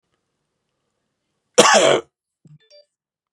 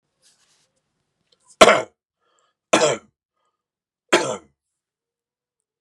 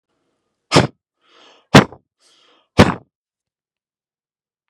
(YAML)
cough_length: 3.3 s
cough_amplitude: 32768
cough_signal_mean_std_ratio: 0.28
three_cough_length: 5.8 s
three_cough_amplitude: 32768
three_cough_signal_mean_std_ratio: 0.22
exhalation_length: 4.7 s
exhalation_amplitude: 32768
exhalation_signal_mean_std_ratio: 0.2
survey_phase: beta (2021-08-13 to 2022-03-07)
age: 45-64
gender: Male
wearing_mask: 'No'
symptom_none: true
smoker_status: Ex-smoker
respiratory_condition_asthma: false
respiratory_condition_other: false
recruitment_source: REACT
submission_delay: 4 days
covid_test_result: Negative
covid_test_method: RT-qPCR
influenza_a_test_result: Negative
influenza_b_test_result: Negative